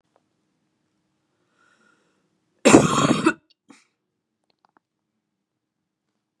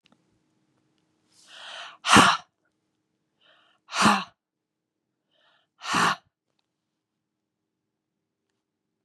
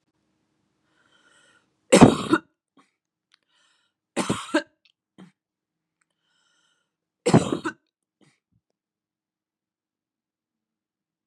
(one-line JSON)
{"cough_length": "6.4 s", "cough_amplitude": 32767, "cough_signal_mean_std_ratio": 0.22, "exhalation_length": "9.0 s", "exhalation_amplitude": 28689, "exhalation_signal_mean_std_ratio": 0.23, "three_cough_length": "11.3 s", "three_cough_amplitude": 32768, "three_cough_signal_mean_std_ratio": 0.18, "survey_phase": "beta (2021-08-13 to 2022-03-07)", "age": "18-44", "gender": "Female", "wearing_mask": "No", "symptom_none": true, "smoker_status": "Never smoked", "respiratory_condition_asthma": false, "respiratory_condition_other": false, "recruitment_source": "REACT", "submission_delay": "2 days", "covid_test_result": "Negative", "covid_test_method": "RT-qPCR", "influenza_a_test_result": "Negative", "influenza_b_test_result": "Negative"}